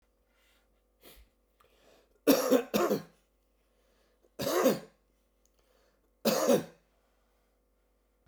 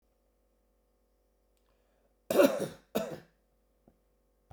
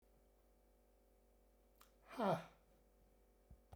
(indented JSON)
{
  "three_cough_length": "8.3 s",
  "three_cough_amplitude": 11230,
  "three_cough_signal_mean_std_ratio": 0.32,
  "cough_length": "4.5 s",
  "cough_amplitude": 9849,
  "cough_signal_mean_std_ratio": 0.24,
  "exhalation_length": "3.8 s",
  "exhalation_amplitude": 1741,
  "exhalation_signal_mean_std_ratio": 0.27,
  "survey_phase": "beta (2021-08-13 to 2022-03-07)",
  "age": "45-64",
  "gender": "Male",
  "wearing_mask": "No",
  "symptom_cough_any": true,
  "symptom_sore_throat": true,
  "symptom_onset": "4 days",
  "smoker_status": "Ex-smoker",
  "respiratory_condition_asthma": false,
  "respiratory_condition_other": false,
  "recruitment_source": "Test and Trace",
  "submission_delay": "2 days",
  "covid_test_result": "Positive",
  "covid_test_method": "RT-qPCR",
  "covid_ct_value": 17.6,
  "covid_ct_gene": "ORF1ab gene",
  "covid_ct_mean": 18.0,
  "covid_viral_load": "1200000 copies/ml",
  "covid_viral_load_category": "High viral load (>1M copies/ml)"
}